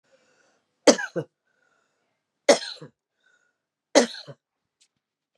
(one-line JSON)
{"three_cough_length": "5.4 s", "three_cough_amplitude": 28205, "three_cough_signal_mean_std_ratio": 0.2, "survey_phase": "beta (2021-08-13 to 2022-03-07)", "age": "65+", "gender": "Female", "wearing_mask": "No", "symptom_none": true, "smoker_status": "Ex-smoker", "respiratory_condition_asthma": false, "respiratory_condition_other": false, "recruitment_source": "REACT", "submission_delay": "2 days", "covid_test_result": "Negative", "covid_test_method": "RT-qPCR", "influenza_a_test_result": "Unknown/Void", "influenza_b_test_result": "Unknown/Void"}